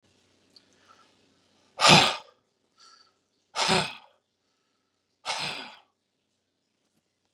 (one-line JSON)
{"exhalation_length": "7.3 s", "exhalation_amplitude": 25180, "exhalation_signal_mean_std_ratio": 0.24, "survey_phase": "beta (2021-08-13 to 2022-03-07)", "age": "45-64", "gender": "Male", "wearing_mask": "No", "symptom_none": true, "smoker_status": "Never smoked", "respiratory_condition_asthma": false, "respiratory_condition_other": false, "recruitment_source": "REACT", "submission_delay": "2 days", "covid_test_result": "Negative", "covid_test_method": "RT-qPCR", "influenza_a_test_result": "Negative", "influenza_b_test_result": "Negative"}